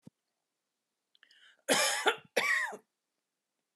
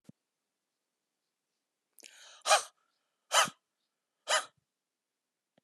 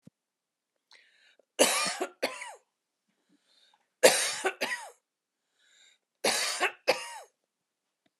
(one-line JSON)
{"cough_length": "3.8 s", "cough_amplitude": 9748, "cough_signal_mean_std_ratio": 0.37, "exhalation_length": "5.6 s", "exhalation_amplitude": 10231, "exhalation_signal_mean_std_ratio": 0.22, "three_cough_length": "8.2 s", "three_cough_amplitude": 17423, "three_cough_signal_mean_std_ratio": 0.33, "survey_phase": "alpha (2021-03-01 to 2021-08-12)", "age": "45-64", "gender": "Female", "wearing_mask": "No", "symptom_none": true, "smoker_status": "Ex-smoker", "respiratory_condition_asthma": false, "respiratory_condition_other": false, "recruitment_source": "REACT", "submission_delay": "2 days", "covid_test_result": "Negative", "covid_test_method": "RT-qPCR"}